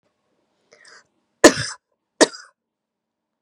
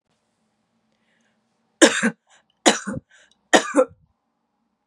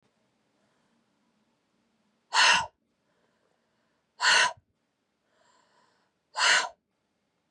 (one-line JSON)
{"cough_length": "3.4 s", "cough_amplitude": 32768, "cough_signal_mean_std_ratio": 0.17, "three_cough_length": "4.9 s", "three_cough_amplitude": 32767, "three_cough_signal_mean_std_ratio": 0.26, "exhalation_length": "7.5 s", "exhalation_amplitude": 12639, "exhalation_signal_mean_std_ratio": 0.28, "survey_phase": "beta (2021-08-13 to 2022-03-07)", "age": "45-64", "gender": "Female", "wearing_mask": "No", "symptom_cough_any": true, "symptom_runny_or_blocked_nose": true, "symptom_fatigue": true, "symptom_headache": true, "smoker_status": "Ex-smoker", "respiratory_condition_asthma": true, "respiratory_condition_other": false, "recruitment_source": "Test and Trace", "submission_delay": "1 day", "covid_test_result": "Positive", "covid_test_method": "LFT"}